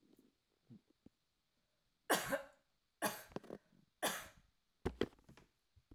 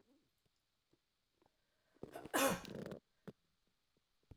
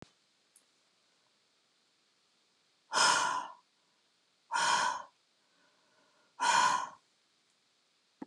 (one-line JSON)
{"three_cough_length": "5.9 s", "three_cough_amplitude": 3376, "three_cough_signal_mean_std_ratio": 0.29, "cough_length": "4.4 s", "cough_amplitude": 2778, "cough_signal_mean_std_ratio": 0.27, "exhalation_length": "8.3 s", "exhalation_amplitude": 6187, "exhalation_signal_mean_std_ratio": 0.35, "survey_phase": "alpha (2021-03-01 to 2021-08-12)", "age": "45-64", "gender": "Female", "wearing_mask": "No", "symptom_none": true, "smoker_status": "Never smoked", "respiratory_condition_asthma": false, "respiratory_condition_other": false, "recruitment_source": "REACT", "submission_delay": "3 days", "covid_test_result": "Negative", "covid_test_method": "RT-qPCR"}